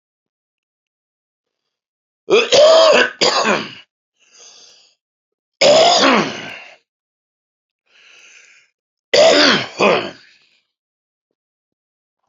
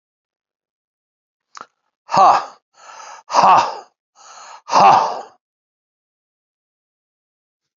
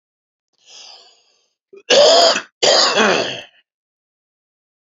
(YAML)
three_cough_length: 12.3 s
three_cough_amplitude: 32768
three_cough_signal_mean_std_ratio: 0.39
exhalation_length: 7.8 s
exhalation_amplitude: 31056
exhalation_signal_mean_std_ratio: 0.31
cough_length: 4.9 s
cough_amplitude: 32022
cough_signal_mean_std_ratio: 0.41
survey_phase: beta (2021-08-13 to 2022-03-07)
age: 45-64
gender: Male
wearing_mask: 'No'
symptom_none: true
symptom_onset: 12 days
smoker_status: Ex-smoker
respiratory_condition_asthma: true
respiratory_condition_other: false
recruitment_source: REACT
submission_delay: 3 days
covid_test_result: Negative
covid_test_method: RT-qPCR
influenza_a_test_result: Negative
influenza_b_test_result: Negative